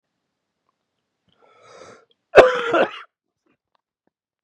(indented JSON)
{
  "cough_length": "4.4 s",
  "cough_amplitude": 32768,
  "cough_signal_mean_std_ratio": 0.23,
  "survey_phase": "beta (2021-08-13 to 2022-03-07)",
  "age": "45-64",
  "gender": "Male",
  "wearing_mask": "No",
  "symptom_cough_any": true,
  "symptom_runny_or_blocked_nose": true,
  "symptom_shortness_of_breath": true,
  "symptom_headache": true,
  "symptom_onset": "2 days",
  "smoker_status": "Current smoker (11 or more cigarettes per day)",
  "respiratory_condition_asthma": false,
  "respiratory_condition_other": false,
  "recruitment_source": "Test and Trace",
  "submission_delay": "1 day",
  "covid_test_result": "Negative",
  "covid_test_method": "RT-qPCR"
}